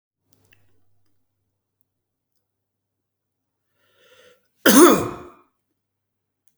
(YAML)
cough_length: 6.6 s
cough_amplitude: 32768
cough_signal_mean_std_ratio: 0.19
survey_phase: beta (2021-08-13 to 2022-03-07)
age: 45-64
gender: Male
wearing_mask: 'No'
symptom_none: true
smoker_status: Ex-smoker
respiratory_condition_asthma: false
respiratory_condition_other: false
recruitment_source: REACT
submission_delay: 0 days
covid_test_result: Negative
covid_test_method: RT-qPCR